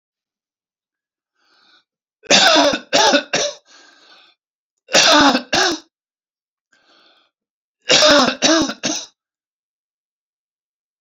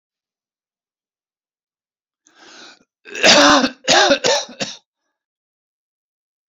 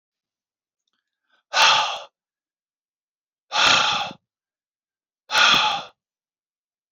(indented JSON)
{
  "three_cough_length": "11.0 s",
  "three_cough_amplitude": 32768,
  "three_cough_signal_mean_std_ratio": 0.39,
  "cough_length": "6.5 s",
  "cough_amplitude": 32768,
  "cough_signal_mean_std_ratio": 0.33,
  "exhalation_length": "6.9 s",
  "exhalation_amplitude": 26478,
  "exhalation_signal_mean_std_ratio": 0.36,
  "survey_phase": "beta (2021-08-13 to 2022-03-07)",
  "age": "18-44",
  "gender": "Male",
  "wearing_mask": "No",
  "symptom_cough_any": true,
  "symptom_fatigue": true,
  "symptom_onset": "7 days",
  "smoker_status": "Ex-smoker",
  "respiratory_condition_asthma": false,
  "respiratory_condition_other": false,
  "recruitment_source": "REACT",
  "submission_delay": "2 days",
  "covid_test_result": "Positive",
  "covid_test_method": "RT-qPCR",
  "covid_ct_value": 21.5,
  "covid_ct_gene": "E gene",
  "influenza_a_test_result": "Negative",
  "influenza_b_test_result": "Negative"
}